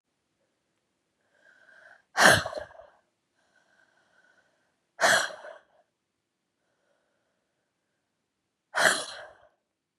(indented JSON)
{
  "exhalation_length": "10.0 s",
  "exhalation_amplitude": 26176,
  "exhalation_signal_mean_std_ratio": 0.23,
  "survey_phase": "beta (2021-08-13 to 2022-03-07)",
  "age": "18-44",
  "gender": "Female",
  "wearing_mask": "No",
  "symptom_cough_any": true,
  "symptom_runny_or_blocked_nose": true,
  "symptom_fatigue": true,
  "symptom_other": true,
  "symptom_onset": "3 days",
  "smoker_status": "Ex-smoker",
  "respiratory_condition_asthma": true,
  "respiratory_condition_other": false,
  "recruitment_source": "Test and Trace",
  "submission_delay": "1 day",
  "covid_test_result": "Positive",
  "covid_test_method": "RT-qPCR",
  "covid_ct_value": 20.6,
  "covid_ct_gene": "N gene"
}